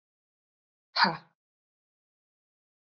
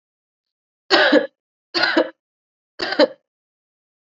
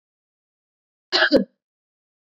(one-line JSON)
{"exhalation_length": "2.8 s", "exhalation_amplitude": 10509, "exhalation_signal_mean_std_ratio": 0.19, "three_cough_length": "4.0 s", "three_cough_amplitude": 27023, "three_cough_signal_mean_std_ratio": 0.35, "cough_length": "2.2 s", "cough_amplitude": 23555, "cough_signal_mean_std_ratio": 0.27, "survey_phase": "alpha (2021-03-01 to 2021-08-12)", "age": "18-44", "gender": "Female", "wearing_mask": "No", "symptom_none": true, "symptom_onset": "4 days", "smoker_status": "Never smoked", "respiratory_condition_asthma": false, "respiratory_condition_other": false, "recruitment_source": "Test and Trace", "submission_delay": "2 days", "covid_test_result": "Positive", "covid_test_method": "RT-qPCR", "covid_ct_value": 27.9, "covid_ct_gene": "ORF1ab gene", "covid_ct_mean": 28.9, "covid_viral_load": "320 copies/ml", "covid_viral_load_category": "Minimal viral load (< 10K copies/ml)"}